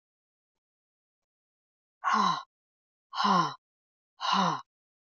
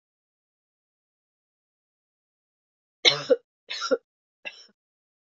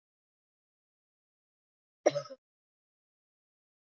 {"exhalation_length": "5.1 s", "exhalation_amplitude": 6939, "exhalation_signal_mean_std_ratio": 0.38, "three_cough_length": "5.4 s", "three_cough_amplitude": 23994, "three_cough_signal_mean_std_ratio": 0.19, "cough_length": "3.9 s", "cough_amplitude": 11017, "cough_signal_mean_std_ratio": 0.12, "survey_phase": "beta (2021-08-13 to 2022-03-07)", "age": "45-64", "gender": "Female", "wearing_mask": "No", "symptom_runny_or_blocked_nose": true, "symptom_sore_throat": true, "symptom_fatigue": true, "symptom_headache": true, "smoker_status": "Never smoked", "respiratory_condition_asthma": false, "respiratory_condition_other": false, "recruitment_source": "Test and Trace", "submission_delay": "2 days", "covid_test_result": "Positive", "covid_test_method": "RT-qPCR", "covid_ct_value": 25.2, "covid_ct_gene": "ORF1ab gene", "covid_ct_mean": 25.7, "covid_viral_load": "3700 copies/ml", "covid_viral_load_category": "Minimal viral load (< 10K copies/ml)"}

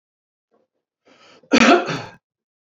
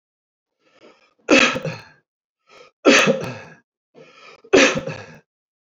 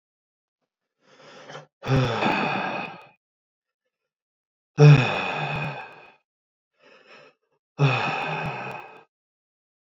{"cough_length": "2.7 s", "cough_amplitude": 27756, "cough_signal_mean_std_ratio": 0.3, "three_cough_length": "5.7 s", "three_cough_amplitude": 27665, "three_cough_signal_mean_std_ratio": 0.34, "exhalation_length": "10.0 s", "exhalation_amplitude": 21945, "exhalation_signal_mean_std_ratio": 0.36, "survey_phase": "beta (2021-08-13 to 2022-03-07)", "age": "45-64", "gender": "Male", "wearing_mask": "No", "symptom_none": true, "smoker_status": "Ex-smoker", "respiratory_condition_asthma": false, "respiratory_condition_other": false, "recruitment_source": "Test and Trace", "submission_delay": "1 day", "covid_test_result": "Negative", "covid_test_method": "ePCR"}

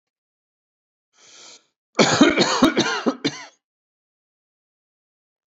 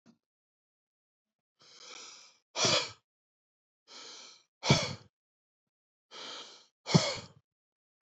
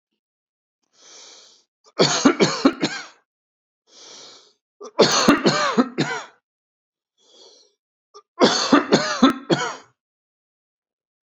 {"cough_length": "5.5 s", "cough_amplitude": 28001, "cough_signal_mean_std_ratio": 0.34, "exhalation_length": "8.0 s", "exhalation_amplitude": 11217, "exhalation_signal_mean_std_ratio": 0.27, "three_cough_length": "11.3 s", "three_cough_amplitude": 29731, "three_cough_signal_mean_std_ratio": 0.38, "survey_phase": "alpha (2021-03-01 to 2021-08-12)", "age": "45-64", "gender": "Male", "wearing_mask": "No", "symptom_none": true, "smoker_status": "Never smoked", "respiratory_condition_asthma": false, "respiratory_condition_other": false, "recruitment_source": "REACT", "submission_delay": "1 day", "covid_test_result": "Negative", "covid_test_method": "RT-qPCR"}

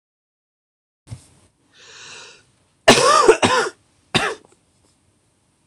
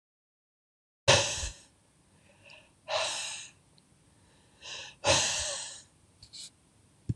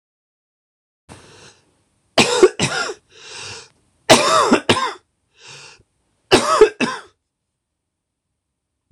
{"cough_length": "5.7 s", "cough_amplitude": 26028, "cough_signal_mean_std_ratio": 0.32, "exhalation_length": "7.2 s", "exhalation_amplitude": 14784, "exhalation_signal_mean_std_ratio": 0.36, "three_cough_length": "8.9 s", "three_cough_amplitude": 26028, "three_cough_signal_mean_std_ratio": 0.34, "survey_phase": "beta (2021-08-13 to 2022-03-07)", "age": "18-44", "gender": "Male", "wearing_mask": "No", "symptom_cough_any": true, "symptom_new_continuous_cough": true, "symptom_runny_or_blocked_nose": true, "symptom_sore_throat": true, "symptom_fever_high_temperature": true, "symptom_onset": "3 days", "smoker_status": "Ex-smoker", "respiratory_condition_asthma": false, "respiratory_condition_other": false, "recruitment_source": "Test and Trace", "submission_delay": "3 days", "covid_test_result": "Positive", "covid_test_method": "ePCR"}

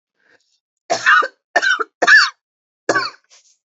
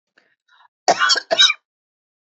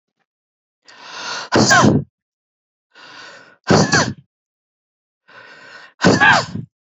{"three_cough_length": "3.8 s", "three_cough_amplitude": 30896, "three_cough_signal_mean_std_ratio": 0.4, "cough_length": "2.3 s", "cough_amplitude": 29153, "cough_signal_mean_std_ratio": 0.36, "exhalation_length": "7.0 s", "exhalation_amplitude": 32307, "exhalation_signal_mean_std_ratio": 0.39, "survey_phase": "beta (2021-08-13 to 2022-03-07)", "age": "45-64", "gender": "Female", "wearing_mask": "No", "symptom_fatigue": true, "symptom_other": true, "symptom_onset": "5 days", "smoker_status": "Never smoked", "respiratory_condition_asthma": false, "respiratory_condition_other": false, "recruitment_source": "REACT", "submission_delay": "1 day", "covid_test_result": "Negative", "covid_test_method": "RT-qPCR", "influenza_a_test_result": "Negative", "influenza_b_test_result": "Negative"}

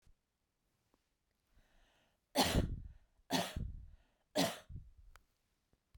{"three_cough_length": "6.0 s", "three_cough_amplitude": 4927, "three_cough_signal_mean_std_ratio": 0.34, "survey_phase": "beta (2021-08-13 to 2022-03-07)", "age": "45-64", "gender": "Female", "wearing_mask": "No", "symptom_sore_throat": true, "symptom_onset": "13 days", "smoker_status": "Never smoked", "respiratory_condition_asthma": false, "respiratory_condition_other": false, "recruitment_source": "REACT", "submission_delay": "2 days", "covid_test_result": "Negative", "covid_test_method": "RT-qPCR"}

